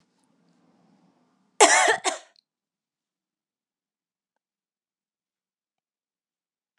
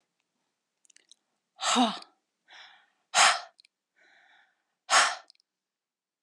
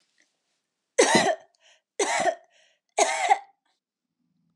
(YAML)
cough_length: 6.8 s
cough_amplitude: 28979
cough_signal_mean_std_ratio: 0.19
exhalation_length: 6.2 s
exhalation_amplitude: 16010
exhalation_signal_mean_std_ratio: 0.28
three_cough_length: 4.6 s
three_cough_amplitude: 17336
three_cough_signal_mean_std_ratio: 0.38
survey_phase: alpha (2021-03-01 to 2021-08-12)
age: 18-44
gender: Female
wearing_mask: 'No'
symptom_none: true
smoker_status: Ex-smoker
respiratory_condition_asthma: false
respiratory_condition_other: false
recruitment_source: REACT
submission_delay: 1 day
covid_test_result: Negative
covid_test_method: RT-qPCR